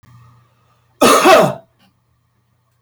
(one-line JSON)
{"cough_length": "2.8 s", "cough_amplitude": 32768, "cough_signal_mean_std_ratio": 0.36, "survey_phase": "beta (2021-08-13 to 2022-03-07)", "age": "45-64", "gender": "Male", "wearing_mask": "No", "symptom_cough_any": true, "smoker_status": "Current smoker (1 to 10 cigarettes per day)", "respiratory_condition_asthma": false, "respiratory_condition_other": false, "recruitment_source": "REACT", "submission_delay": "5 days", "covid_test_result": "Negative", "covid_test_method": "RT-qPCR", "influenza_a_test_result": "Negative", "influenza_b_test_result": "Negative"}